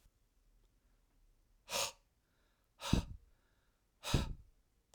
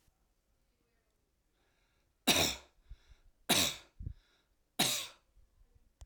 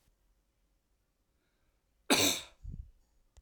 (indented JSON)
{
  "exhalation_length": "4.9 s",
  "exhalation_amplitude": 5225,
  "exhalation_signal_mean_std_ratio": 0.28,
  "three_cough_length": "6.1 s",
  "three_cough_amplitude": 6430,
  "three_cough_signal_mean_std_ratio": 0.3,
  "cough_length": "3.4 s",
  "cough_amplitude": 9745,
  "cough_signal_mean_std_ratio": 0.26,
  "survey_phase": "alpha (2021-03-01 to 2021-08-12)",
  "age": "45-64",
  "gender": "Male",
  "wearing_mask": "No",
  "symptom_none": true,
  "smoker_status": "Never smoked",
  "respiratory_condition_asthma": false,
  "respiratory_condition_other": false,
  "recruitment_source": "REACT",
  "submission_delay": "2 days",
  "covid_test_result": "Negative",
  "covid_test_method": "RT-qPCR"
}